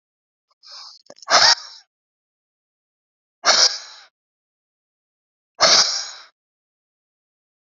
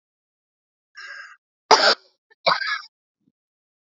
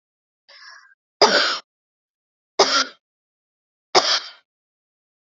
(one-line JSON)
{"exhalation_length": "7.7 s", "exhalation_amplitude": 32046, "exhalation_signal_mean_std_ratio": 0.29, "cough_length": "3.9 s", "cough_amplitude": 31455, "cough_signal_mean_std_ratio": 0.27, "three_cough_length": "5.4 s", "three_cough_amplitude": 31714, "three_cough_signal_mean_std_ratio": 0.3, "survey_phase": "beta (2021-08-13 to 2022-03-07)", "age": "18-44", "gender": "Female", "wearing_mask": "No", "symptom_shortness_of_breath": true, "symptom_abdominal_pain": true, "symptom_fatigue": true, "symptom_headache": true, "symptom_loss_of_taste": true, "symptom_onset": "12 days", "smoker_status": "Never smoked", "respiratory_condition_asthma": true, "respiratory_condition_other": true, "recruitment_source": "REACT", "submission_delay": "15 days", "covid_test_result": "Negative", "covid_test_method": "RT-qPCR", "influenza_a_test_result": "Negative", "influenza_b_test_result": "Negative"}